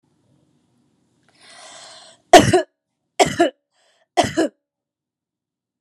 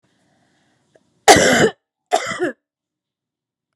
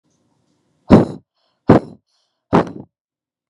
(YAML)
three_cough_length: 5.8 s
three_cough_amplitude: 32768
three_cough_signal_mean_std_ratio: 0.25
cough_length: 3.8 s
cough_amplitude: 32768
cough_signal_mean_std_ratio: 0.32
exhalation_length: 3.5 s
exhalation_amplitude: 32768
exhalation_signal_mean_std_ratio: 0.26
survey_phase: beta (2021-08-13 to 2022-03-07)
age: 18-44
gender: Female
wearing_mask: 'No'
symptom_fatigue: true
symptom_fever_high_temperature: true
symptom_headache: true
symptom_change_to_sense_of_smell_or_taste: true
symptom_loss_of_taste: true
symptom_onset: 5 days
smoker_status: Ex-smoker
respiratory_condition_asthma: false
respiratory_condition_other: false
recruitment_source: Test and Trace
submission_delay: 2 days
covid_test_result: Positive
covid_test_method: RT-qPCR
covid_ct_value: 16.5
covid_ct_gene: ORF1ab gene
covid_ct_mean: 16.8
covid_viral_load: 3000000 copies/ml
covid_viral_load_category: High viral load (>1M copies/ml)